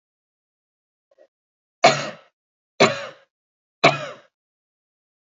{"three_cough_length": "5.2 s", "three_cough_amplitude": 30949, "three_cough_signal_mean_std_ratio": 0.23, "survey_phase": "beta (2021-08-13 to 2022-03-07)", "age": "45-64", "gender": "Female", "wearing_mask": "No", "symptom_none": true, "smoker_status": "Never smoked", "respiratory_condition_asthma": false, "respiratory_condition_other": false, "recruitment_source": "REACT", "submission_delay": "2 days", "covid_test_result": "Negative", "covid_test_method": "RT-qPCR", "influenza_a_test_result": "Negative", "influenza_b_test_result": "Negative"}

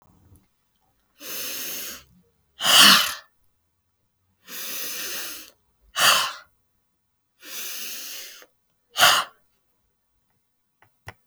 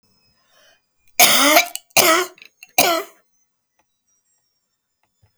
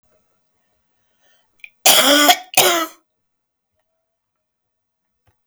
{"exhalation_length": "11.3 s", "exhalation_amplitude": 32270, "exhalation_signal_mean_std_ratio": 0.32, "three_cough_length": "5.4 s", "three_cough_amplitude": 32768, "three_cough_signal_mean_std_ratio": 0.34, "cough_length": "5.5 s", "cough_amplitude": 32768, "cough_signal_mean_std_ratio": 0.3, "survey_phase": "beta (2021-08-13 to 2022-03-07)", "age": "65+", "gender": "Female", "wearing_mask": "No", "symptom_cough_any": true, "symptom_runny_or_blocked_nose": true, "symptom_shortness_of_breath": true, "symptom_diarrhoea": true, "symptom_fatigue": true, "symptom_change_to_sense_of_smell_or_taste": true, "symptom_loss_of_taste": true, "symptom_other": true, "symptom_onset": "12 days", "smoker_status": "Ex-smoker", "respiratory_condition_asthma": false, "respiratory_condition_other": false, "recruitment_source": "REACT", "submission_delay": "1 day", "covid_test_result": "Negative", "covid_test_method": "RT-qPCR"}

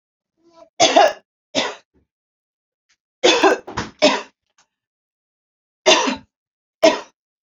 {"three_cough_length": "7.4 s", "three_cough_amplitude": 30185, "three_cough_signal_mean_std_ratio": 0.34, "survey_phase": "beta (2021-08-13 to 2022-03-07)", "age": "18-44", "gender": "Female", "wearing_mask": "No", "symptom_sore_throat": true, "symptom_onset": "12 days", "smoker_status": "Ex-smoker", "respiratory_condition_asthma": false, "respiratory_condition_other": false, "recruitment_source": "REACT", "submission_delay": "2 days", "covid_test_result": "Negative", "covid_test_method": "RT-qPCR", "influenza_a_test_result": "Negative", "influenza_b_test_result": "Negative"}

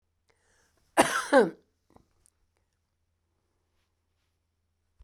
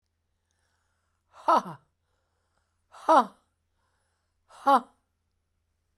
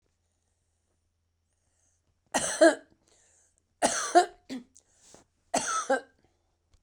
{"cough_length": "5.0 s", "cough_amplitude": 17629, "cough_signal_mean_std_ratio": 0.21, "exhalation_length": "6.0 s", "exhalation_amplitude": 14699, "exhalation_signal_mean_std_ratio": 0.22, "three_cough_length": "6.8 s", "three_cough_amplitude": 14131, "three_cough_signal_mean_std_ratio": 0.28, "survey_phase": "beta (2021-08-13 to 2022-03-07)", "age": "65+", "gender": "Female", "wearing_mask": "No", "symptom_shortness_of_breath": true, "smoker_status": "Never smoked", "respiratory_condition_asthma": false, "respiratory_condition_other": true, "recruitment_source": "REACT", "submission_delay": "1 day", "covid_test_result": "Negative", "covid_test_method": "RT-qPCR"}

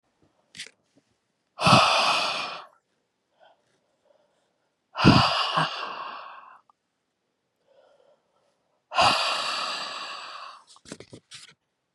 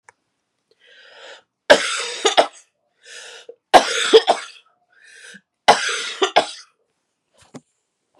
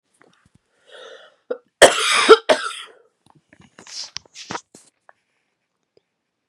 {"exhalation_length": "11.9 s", "exhalation_amplitude": 25237, "exhalation_signal_mean_std_ratio": 0.37, "three_cough_length": "8.2 s", "three_cough_amplitude": 32768, "three_cough_signal_mean_std_ratio": 0.31, "cough_length": "6.5 s", "cough_amplitude": 32768, "cough_signal_mean_std_ratio": 0.24, "survey_phase": "beta (2021-08-13 to 2022-03-07)", "age": "18-44", "gender": "Female", "wearing_mask": "No", "symptom_cough_any": true, "symptom_runny_or_blocked_nose": true, "symptom_fever_high_temperature": true, "symptom_headache": true, "symptom_change_to_sense_of_smell_or_taste": true, "smoker_status": "Ex-smoker", "respiratory_condition_asthma": false, "respiratory_condition_other": false, "recruitment_source": "Test and Trace", "submission_delay": "1 day", "covid_test_result": "Positive", "covid_test_method": "ePCR"}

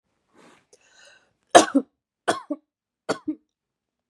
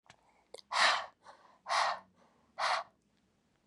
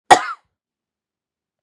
{"three_cough_length": "4.1 s", "three_cough_amplitude": 32768, "three_cough_signal_mean_std_ratio": 0.2, "exhalation_length": "3.7 s", "exhalation_amplitude": 5530, "exhalation_signal_mean_std_ratio": 0.4, "cough_length": "1.6 s", "cough_amplitude": 32768, "cough_signal_mean_std_ratio": 0.2, "survey_phase": "beta (2021-08-13 to 2022-03-07)", "age": "18-44", "gender": "Female", "wearing_mask": "No", "symptom_cough_any": true, "symptom_onset": "12 days", "smoker_status": "Prefer not to say", "respiratory_condition_asthma": false, "respiratory_condition_other": false, "recruitment_source": "REACT", "submission_delay": "3 days", "covid_test_result": "Negative", "covid_test_method": "RT-qPCR", "influenza_a_test_result": "Negative", "influenza_b_test_result": "Negative"}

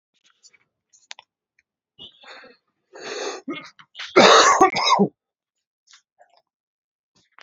{"cough_length": "7.4 s", "cough_amplitude": 30643, "cough_signal_mean_std_ratio": 0.3, "survey_phase": "beta (2021-08-13 to 2022-03-07)", "age": "18-44", "gender": "Male", "wearing_mask": "No", "symptom_cough_any": true, "symptom_runny_or_blocked_nose": true, "symptom_fatigue": true, "symptom_headache": true, "symptom_onset": "3 days", "smoker_status": "Ex-smoker", "respiratory_condition_asthma": false, "respiratory_condition_other": false, "recruitment_source": "Test and Trace", "submission_delay": "1 day", "covid_test_result": "Positive", "covid_test_method": "RT-qPCR", "covid_ct_value": 17.1, "covid_ct_gene": "ORF1ab gene", "covid_ct_mean": 17.4, "covid_viral_load": "1900000 copies/ml", "covid_viral_load_category": "High viral load (>1M copies/ml)"}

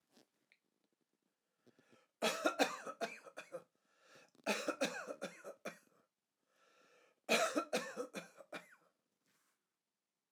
{"three_cough_length": "10.3 s", "three_cough_amplitude": 4016, "three_cough_signal_mean_std_ratio": 0.35, "survey_phase": "alpha (2021-03-01 to 2021-08-12)", "age": "65+", "gender": "Male", "wearing_mask": "No", "symptom_none": true, "smoker_status": "Never smoked", "respiratory_condition_asthma": false, "respiratory_condition_other": false, "recruitment_source": "REACT", "submission_delay": "3 days", "covid_test_result": "Negative", "covid_test_method": "RT-qPCR"}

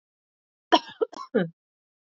{"cough_length": "2.0 s", "cough_amplitude": 21722, "cough_signal_mean_std_ratio": 0.26, "survey_phase": "beta (2021-08-13 to 2022-03-07)", "age": "18-44", "gender": "Female", "wearing_mask": "No", "symptom_cough_any": true, "symptom_runny_or_blocked_nose": true, "symptom_shortness_of_breath": true, "symptom_sore_throat": true, "symptom_diarrhoea": true, "symptom_fatigue": true, "symptom_fever_high_temperature": true, "symptom_headache": true, "symptom_change_to_sense_of_smell_or_taste": true, "smoker_status": "Never smoked", "respiratory_condition_asthma": false, "respiratory_condition_other": false, "recruitment_source": "Test and Trace", "submission_delay": "1 day", "covid_test_result": "Positive", "covid_test_method": "RT-qPCR", "covid_ct_value": 15.8, "covid_ct_gene": "ORF1ab gene", "covid_ct_mean": 16.2, "covid_viral_load": "4800000 copies/ml", "covid_viral_load_category": "High viral load (>1M copies/ml)"}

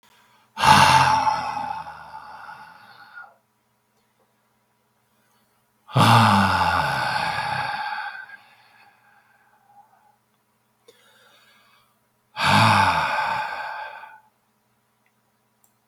{"exhalation_length": "15.9 s", "exhalation_amplitude": 32035, "exhalation_signal_mean_std_ratio": 0.42, "survey_phase": "beta (2021-08-13 to 2022-03-07)", "age": "65+", "gender": "Male", "wearing_mask": "No", "symptom_cough_any": true, "symptom_runny_or_blocked_nose": true, "symptom_sore_throat": true, "symptom_fatigue": true, "symptom_loss_of_taste": true, "symptom_onset": "6 days", "smoker_status": "Ex-smoker", "respiratory_condition_asthma": false, "respiratory_condition_other": false, "recruitment_source": "Test and Trace", "submission_delay": "1 day", "covid_test_result": "Positive", "covid_test_method": "RT-qPCR", "covid_ct_value": 15.8, "covid_ct_gene": "N gene", "covid_ct_mean": 16.2, "covid_viral_load": "4900000 copies/ml", "covid_viral_load_category": "High viral load (>1M copies/ml)"}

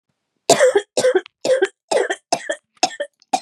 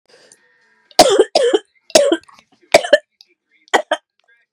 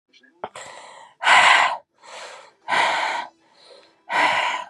{"cough_length": "3.4 s", "cough_amplitude": 32767, "cough_signal_mean_std_ratio": 0.48, "three_cough_length": "4.5 s", "three_cough_amplitude": 32768, "three_cough_signal_mean_std_ratio": 0.35, "exhalation_length": "4.7 s", "exhalation_amplitude": 26391, "exhalation_signal_mean_std_ratio": 0.49, "survey_phase": "beta (2021-08-13 to 2022-03-07)", "age": "18-44", "gender": "Female", "wearing_mask": "No", "symptom_cough_any": true, "symptom_new_continuous_cough": true, "symptom_runny_or_blocked_nose": true, "symptom_sore_throat": true, "symptom_diarrhoea": true, "symptom_fatigue": true, "symptom_fever_high_temperature": true, "symptom_headache": true, "symptom_change_to_sense_of_smell_or_taste": true, "symptom_loss_of_taste": true, "symptom_other": true, "smoker_status": "Ex-smoker", "respiratory_condition_asthma": false, "respiratory_condition_other": false, "recruitment_source": "Test and Trace", "submission_delay": "1 day", "covid_test_result": "Positive", "covid_test_method": "RT-qPCR", "covid_ct_value": 18.5, "covid_ct_gene": "N gene"}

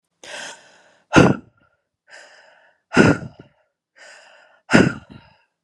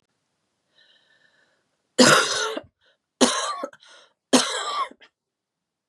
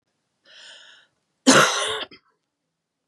{"exhalation_length": "5.6 s", "exhalation_amplitude": 32768, "exhalation_signal_mean_std_ratio": 0.28, "three_cough_length": "5.9 s", "three_cough_amplitude": 28598, "three_cough_signal_mean_std_ratio": 0.34, "cough_length": "3.1 s", "cough_amplitude": 29482, "cough_signal_mean_std_ratio": 0.3, "survey_phase": "beta (2021-08-13 to 2022-03-07)", "age": "45-64", "gender": "Female", "wearing_mask": "No", "symptom_cough_any": true, "symptom_new_continuous_cough": true, "symptom_runny_or_blocked_nose": true, "symptom_shortness_of_breath": true, "symptom_sore_throat": true, "symptom_fatigue": true, "symptom_fever_high_temperature": true, "symptom_headache": true, "symptom_change_to_sense_of_smell_or_taste": true, "symptom_onset": "4 days", "smoker_status": "Never smoked", "respiratory_condition_asthma": true, "respiratory_condition_other": false, "recruitment_source": "Test and Trace", "submission_delay": "1 day", "covid_test_result": "Positive", "covid_test_method": "LAMP"}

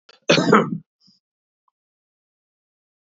{"cough_length": "3.2 s", "cough_amplitude": 28180, "cough_signal_mean_std_ratio": 0.27, "survey_phase": "beta (2021-08-13 to 2022-03-07)", "age": "45-64", "gender": "Male", "wearing_mask": "No", "symptom_cough_any": true, "symptom_runny_or_blocked_nose": true, "symptom_shortness_of_breath": true, "symptom_sore_throat": true, "symptom_headache": true, "symptom_change_to_sense_of_smell_or_taste": true, "smoker_status": "Ex-smoker", "respiratory_condition_asthma": false, "respiratory_condition_other": false, "recruitment_source": "Test and Trace", "submission_delay": "0 days", "covid_test_result": "Positive", "covid_test_method": "LFT"}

